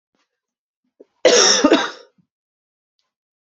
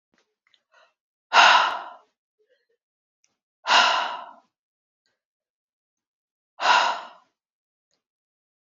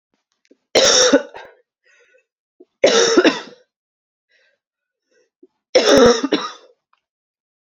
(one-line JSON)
{"cough_length": "3.6 s", "cough_amplitude": 30723, "cough_signal_mean_std_ratio": 0.33, "exhalation_length": "8.6 s", "exhalation_amplitude": 27211, "exhalation_signal_mean_std_ratio": 0.29, "three_cough_length": "7.7 s", "three_cough_amplitude": 32523, "three_cough_signal_mean_std_ratio": 0.37, "survey_phase": "alpha (2021-03-01 to 2021-08-12)", "age": "18-44", "gender": "Female", "wearing_mask": "No", "symptom_fatigue": true, "symptom_headache": true, "symptom_change_to_sense_of_smell_or_taste": true, "symptom_loss_of_taste": true, "smoker_status": "Ex-smoker", "respiratory_condition_asthma": false, "respiratory_condition_other": false, "recruitment_source": "Test and Trace", "submission_delay": "1 day", "covid_test_result": "Positive", "covid_test_method": "RT-qPCR"}